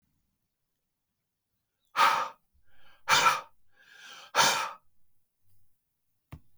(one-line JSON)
{"exhalation_length": "6.6 s", "exhalation_amplitude": 11849, "exhalation_signal_mean_std_ratio": 0.32, "survey_phase": "beta (2021-08-13 to 2022-03-07)", "age": "45-64", "gender": "Male", "wearing_mask": "No", "symptom_cough_any": true, "symptom_runny_or_blocked_nose": true, "symptom_shortness_of_breath": true, "symptom_sore_throat": true, "symptom_fatigue": true, "symptom_onset": "3 days", "smoker_status": "Never smoked", "respiratory_condition_asthma": false, "respiratory_condition_other": false, "recruitment_source": "Test and Trace", "submission_delay": "1 day", "covid_test_result": "Positive", "covid_test_method": "ePCR"}